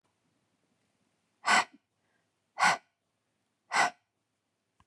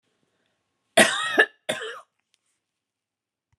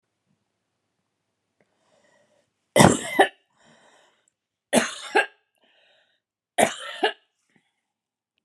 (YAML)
exhalation_length: 4.9 s
exhalation_amplitude: 9160
exhalation_signal_mean_std_ratio: 0.26
cough_length: 3.6 s
cough_amplitude: 24636
cough_signal_mean_std_ratio: 0.27
three_cough_length: 8.4 s
three_cough_amplitude: 32767
three_cough_signal_mean_std_ratio: 0.24
survey_phase: beta (2021-08-13 to 2022-03-07)
age: 45-64
gender: Female
wearing_mask: 'No'
symptom_none: true
smoker_status: Never smoked
respiratory_condition_asthma: false
respiratory_condition_other: false
recruitment_source: REACT
submission_delay: 2 days
covid_test_result: Negative
covid_test_method: RT-qPCR